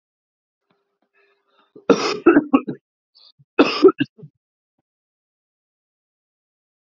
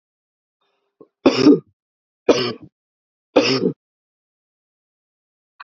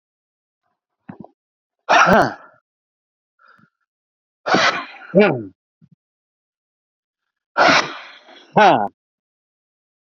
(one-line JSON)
{"cough_length": "6.8 s", "cough_amplitude": 32767, "cough_signal_mean_std_ratio": 0.25, "three_cough_length": "5.6 s", "three_cough_amplitude": 32767, "three_cough_signal_mean_std_ratio": 0.28, "exhalation_length": "10.1 s", "exhalation_amplitude": 32768, "exhalation_signal_mean_std_ratio": 0.32, "survey_phase": "alpha (2021-03-01 to 2021-08-12)", "age": "18-44", "gender": "Male", "wearing_mask": "No", "symptom_cough_any": true, "symptom_fatigue": true, "symptom_fever_high_temperature": true, "symptom_headache": true, "symptom_change_to_sense_of_smell_or_taste": true, "symptom_onset": "5 days", "smoker_status": "Current smoker (e-cigarettes or vapes only)", "respiratory_condition_asthma": false, "respiratory_condition_other": false, "recruitment_source": "Test and Trace", "submission_delay": "2 days", "covid_test_result": "Positive", "covid_test_method": "RT-qPCR", "covid_ct_value": 19.5, "covid_ct_gene": "ORF1ab gene", "covid_ct_mean": 20.0, "covid_viral_load": "290000 copies/ml", "covid_viral_load_category": "Low viral load (10K-1M copies/ml)"}